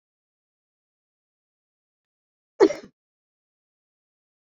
cough_length: 4.4 s
cough_amplitude: 23631
cough_signal_mean_std_ratio: 0.12
survey_phase: beta (2021-08-13 to 2022-03-07)
age: 65+
gender: Female
wearing_mask: 'No'
symptom_none: true
smoker_status: Never smoked
respiratory_condition_asthma: false
respiratory_condition_other: false
recruitment_source: REACT
submission_delay: 2 days
covid_test_result: Negative
covid_test_method: RT-qPCR
influenza_a_test_result: Negative
influenza_b_test_result: Negative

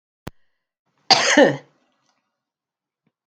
cough_length: 3.3 s
cough_amplitude: 31397
cough_signal_mean_std_ratio: 0.27
survey_phase: beta (2021-08-13 to 2022-03-07)
age: 65+
gender: Female
wearing_mask: 'No'
symptom_runny_or_blocked_nose: true
smoker_status: Ex-smoker
respiratory_condition_asthma: false
respiratory_condition_other: false
recruitment_source: REACT
submission_delay: 5 days
covid_test_result: Negative
covid_test_method: RT-qPCR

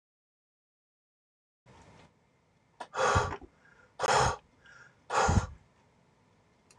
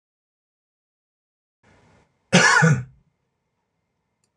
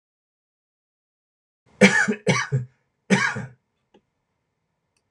exhalation_length: 6.8 s
exhalation_amplitude: 8292
exhalation_signal_mean_std_ratio: 0.34
cough_length: 4.4 s
cough_amplitude: 24939
cough_signal_mean_std_ratio: 0.28
three_cough_length: 5.1 s
three_cough_amplitude: 26028
three_cough_signal_mean_std_ratio: 0.31
survey_phase: beta (2021-08-13 to 2022-03-07)
age: 65+
gender: Male
wearing_mask: 'No'
symptom_none: true
smoker_status: Ex-smoker
respiratory_condition_asthma: false
respiratory_condition_other: false
recruitment_source: REACT
submission_delay: 3 days
covid_test_result: Negative
covid_test_method: RT-qPCR
influenza_a_test_result: Unknown/Void
influenza_b_test_result: Unknown/Void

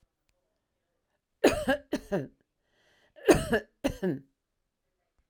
cough_length: 5.3 s
cough_amplitude: 16505
cough_signal_mean_std_ratio: 0.3
survey_phase: alpha (2021-03-01 to 2021-08-12)
age: 65+
gender: Female
wearing_mask: 'No'
symptom_none: true
smoker_status: Ex-smoker
respiratory_condition_asthma: false
respiratory_condition_other: false
recruitment_source: REACT
submission_delay: 2 days
covid_test_result: Negative
covid_test_method: RT-qPCR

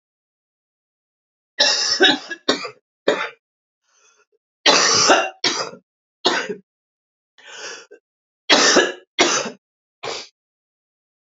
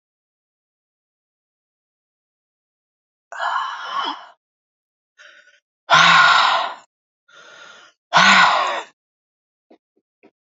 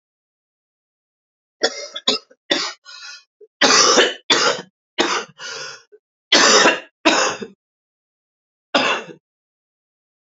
three_cough_length: 11.3 s
three_cough_amplitude: 31397
three_cough_signal_mean_std_ratio: 0.39
exhalation_length: 10.5 s
exhalation_amplitude: 32767
exhalation_signal_mean_std_ratio: 0.34
cough_length: 10.2 s
cough_amplitude: 32768
cough_signal_mean_std_ratio: 0.4
survey_phase: alpha (2021-03-01 to 2021-08-12)
age: 45-64
gender: Female
wearing_mask: 'No'
symptom_cough_any: true
symptom_new_continuous_cough: true
symptom_shortness_of_breath: true
symptom_fatigue: true
symptom_onset: 8 days
smoker_status: Current smoker (11 or more cigarettes per day)
respiratory_condition_asthma: false
respiratory_condition_other: false
recruitment_source: Test and Trace
submission_delay: 1 day
covid_test_result: Positive
covid_test_method: RT-qPCR
covid_ct_value: 38.1
covid_ct_gene: N gene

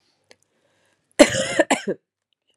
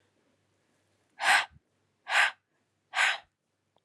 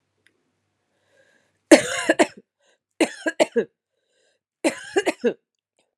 cough_length: 2.6 s
cough_amplitude: 32768
cough_signal_mean_std_ratio: 0.28
exhalation_length: 3.8 s
exhalation_amplitude: 11048
exhalation_signal_mean_std_ratio: 0.33
three_cough_length: 6.0 s
three_cough_amplitude: 32768
three_cough_signal_mean_std_ratio: 0.27
survey_phase: beta (2021-08-13 to 2022-03-07)
age: 45-64
gender: Female
wearing_mask: 'No'
symptom_cough_any: true
symptom_sore_throat: true
symptom_fatigue: true
symptom_fever_high_temperature: true
symptom_onset: 2 days
smoker_status: Never smoked
respiratory_condition_asthma: false
respiratory_condition_other: false
recruitment_source: Test and Trace
submission_delay: 1 day
covid_test_result: Positive
covid_test_method: RT-qPCR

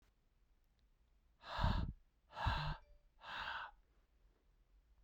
exhalation_length: 5.0 s
exhalation_amplitude: 2103
exhalation_signal_mean_std_ratio: 0.41
survey_phase: beta (2021-08-13 to 2022-03-07)
age: 18-44
gender: Male
wearing_mask: 'No'
symptom_cough_any: true
symptom_runny_or_blocked_nose: true
symptom_sore_throat: true
symptom_fatigue: true
symptom_headache: true
symptom_onset: 3 days
smoker_status: Never smoked
respiratory_condition_asthma: false
respiratory_condition_other: false
recruitment_source: Test and Trace
submission_delay: 2 days
covid_test_result: Positive
covid_test_method: RT-qPCR
covid_ct_value: 32.3
covid_ct_gene: N gene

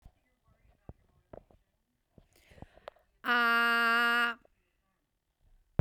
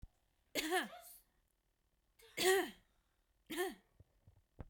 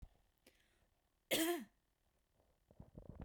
exhalation_length: 5.8 s
exhalation_amplitude: 6627
exhalation_signal_mean_std_ratio: 0.36
three_cough_length: 4.7 s
three_cough_amplitude: 3872
three_cough_signal_mean_std_ratio: 0.35
cough_length: 3.2 s
cough_amplitude: 2295
cough_signal_mean_std_ratio: 0.31
survey_phase: beta (2021-08-13 to 2022-03-07)
age: 18-44
gender: Female
wearing_mask: 'No'
symptom_cough_any: true
symptom_runny_or_blocked_nose: true
symptom_shortness_of_breath: true
symptom_sore_throat: true
symptom_fatigue: true
symptom_onset: 4 days
smoker_status: Never smoked
respiratory_condition_asthma: false
respiratory_condition_other: false
recruitment_source: Test and Trace
submission_delay: 2 days
covid_test_result: Positive
covid_test_method: RT-qPCR
covid_ct_value: 28.1
covid_ct_gene: ORF1ab gene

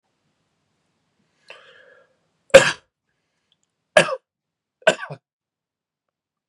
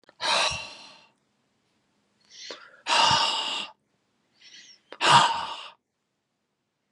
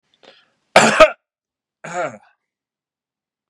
three_cough_length: 6.5 s
three_cough_amplitude: 32768
three_cough_signal_mean_std_ratio: 0.17
exhalation_length: 6.9 s
exhalation_amplitude: 19863
exhalation_signal_mean_std_ratio: 0.39
cough_length: 3.5 s
cough_amplitude: 32768
cough_signal_mean_std_ratio: 0.26
survey_phase: beta (2021-08-13 to 2022-03-07)
age: 18-44
gender: Male
wearing_mask: 'No'
symptom_none: true
smoker_status: Never smoked
respiratory_condition_asthma: false
respiratory_condition_other: false
recruitment_source: REACT
submission_delay: 7 days
covid_test_result: Negative
covid_test_method: RT-qPCR
influenza_a_test_result: Unknown/Void
influenza_b_test_result: Unknown/Void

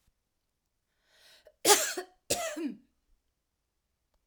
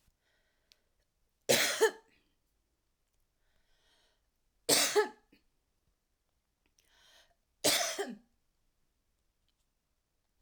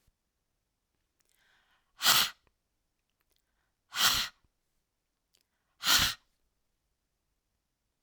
cough_length: 4.3 s
cough_amplitude: 21243
cough_signal_mean_std_ratio: 0.27
three_cough_length: 10.4 s
three_cough_amplitude: 7837
three_cough_signal_mean_std_ratio: 0.26
exhalation_length: 8.0 s
exhalation_amplitude: 15048
exhalation_signal_mean_std_ratio: 0.25
survey_phase: alpha (2021-03-01 to 2021-08-12)
age: 65+
gender: Female
wearing_mask: 'Yes'
symptom_none: true
smoker_status: Never smoked
respiratory_condition_asthma: false
respiratory_condition_other: false
recruitment_source: REACT
submission_delay: 1 day
covid_test_result: Negative
covid_test_method: RT-qPCR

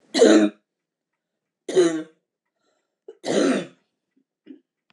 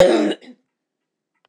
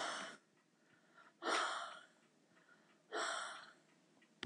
three_cough_length: 4.9 s
three_cough_amplitude: 22720
three_cough_signal_mean_std_ratio: 0.36
cough_length: 1.5 s
cough_amplitude: 26028
cough_signal_mean_std_ratio: 0.39
exhalation_length: 4.5 s
exhalation_amplitude: 1793
exhalation_signal_mean_std_ratio: 0.48
survey_phase: beta (2021-08-13 to 2022-03-07)
age: 65+
gender: Female
wearing_mask: 'No'
symptom_cough_any: true
smoker_status: Never smoked
respiratory_condition_asthma: false
respiratory_condition_other: false
recruitment_source: REACT
submission_delay: 2 days
covid_test_result: Negative
covid_test_method: RT-qPCR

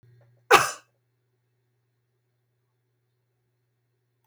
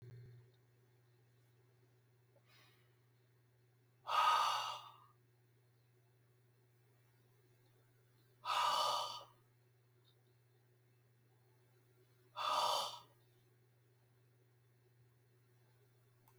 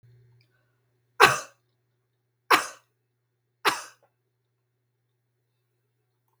cough_length: 4.3 s
cough_amplitude: 32188
cough_signal_mean_std_ratio: 0.15
exhalation_length: 16.4 s
exhalation_amplitude: 2339
exhalation_signal_mean_std_ratio: 0.32
three_cough_length: 6.4 s
three_cough_amplitude: 32768
three_cough_signal_mean_std_ratio: 0.18
survey_phase: beta (2021-08-13 to 2022-03-07)
age: 45-64
gender: Female
wearing_mask: 'No'
symptom_none: true
smoker_status: Never smoked
respiratory_condition_asthma: false
respiratory_condition_other: false
recruitment_source: REACT
submission_delay: 4 days
covid_test_result: Negative
covid_test_method: RT-qPCR
influenza_a_test_result: Negative
influenza_b_test_result: Negative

